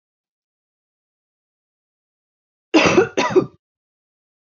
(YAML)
cough_length: 4.5 s
cough_amplitude: 26875
cough_signal_mean_std_ratio: 0.27
survey_phase: beta (2021-08-13 to 2022-03-07)
age: 18-44
gender: Female
wearing_mask: 'No'
symptom_change_to_sense_of_smell_or_taste: true
smoker_status: Current smoker (1 to 10 cigarettes per day)
respiratory_condition_asthma: false
respiratory_condition_other: false
recruitment_source: Test and Trace
submission_delay: 1 day
covid_test_result: Negative
covid_test_method: RT-qPCR